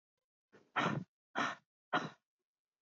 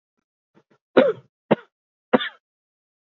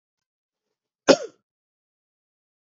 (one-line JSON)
{"exhalation_length": "2.8 s", "exhalation_amplitude": 2623, "exhalation_signal_mean_std_ratio": 0.36, "three_cough_length": "3.2 s", "three_cough_amplitude": 26912, "three_cough_signal_mean_std_ratio": 0.23, "cough_length": "2.7 s", "cough_amplitude": 31995, "cough_signal_mean_std_ratio": 0.13, "survey_phase": "beta (2021-08-13 to 2022-03-07)", "age": "18-44", "gender": "Male", "wearing_mask": "No", "symptom_cough_any": true, "symptom_runny_or_blocked_nose": true, "symptom_shortness_of_breath": true, "symptom_fatigue": true, "symptom_change_to_sense_of_smell_or_taste": true, "symptom_loss_of_taste": true, "symptom_onset": "3 days", "smoker_status": "Ex-smoker", "respiratory_condition_asthma": false, "respiratory_condition_other": false, "recruitment_source": "Test and Trace", "submission_delay": "2 days", "covid_test_result": "Positive", "covid_test_method": "RT-qPCR", "covid_ct_value": 15.8, "covid_ct_gene": "ORF1ab gene", "covid_ct_mean": 16.1, "covid_viral_load": "5200000 copies/ml", "covid_viral_load_category": "High viral load (>1M copies/ml)"}